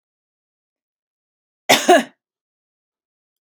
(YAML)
cough_length: 3.4 s
cough_amplitude: 32768
cough_signal_mean_std_ratio: 0.22
survey_phase: beta (2021-08-13 to 2022-03-07)
age: 45-64
gender: Female
wearing_mask: 'No'
symptom_sore_throat: true
symptom_fatigue: true
symptom_headache: true
symptom_other: true
smoker_status: Never smoked
respiratory_condition_asthma: false
respiratory_condition_other: false
recruitment_source: Test and Trace
submission_delay: 1 day
covid_test_result: Positive
covid_test_method: ePCR